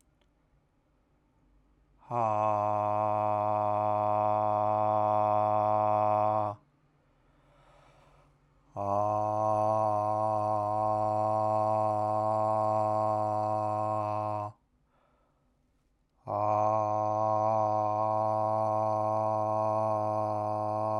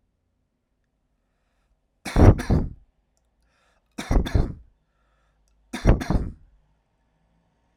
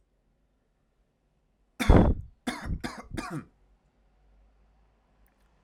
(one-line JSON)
{"exhalation_length": "21.0 s", "exhalation_amplitude": 4720, "exhalation_signal_mean_std_ratio": 0.8, "three_cough_length": "7.8 s", "three_cough_amplitude": 29658, "three_cough_signal_mean_std_ratio": 0.29, "cough_length": "5.6 s", "cough_amplitude": 19816, "cough_signal_mean_std_ratio": 0.26, "survey_phase": "alpha (2021-03-01 to 2021-08-12)", "age": "18-44", "gender": "Male", "wearing_mask": "No", "symptom_cough_any": true, "symptom_headache": true, "symptom_change_to_sense_of_smell_or_taste": true, "smoker_status": "Never smoked", "respiratory_condition_asthma": false, "respiratory_condition_other": false, "recruitment_source": "Test and Trace", "submission_delay": "2 days", "covid_test_result": "Positive", "covid_test_method": "RT-qPCR", "covid_ct_value": 12.0, "covid_ct_gene": "ORF1ab gene", "covid_ct_mean": 12.6, "covid_viral_load": "74000000 copies/ml", "covid_viral_load_category": "High viral load (>1M copies/ml)"}